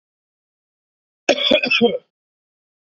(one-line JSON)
{"cough_length": "2.9 s", "cough_amplitude": 31159, "cough_signal_mean_std_ratio": 0.35, "survey_phase": "beta (2021-08-13 to 2022-03-07)", "age": "18-44", "gender": "Male", "wearing_mask": "No", "symptom_none": true, "smoker_status": "Ex-smoker", "respiratory_condition_asthma": false, "respiratory_condition_other": false, "recruitment_source": "REACT", "submission_delay": "1 day", "covid_test_result": "Negative", "covid_test_method": "RT-qPCR", "influenza_a_test_result": "Negative", "influenza_b_test_result": "Negative"}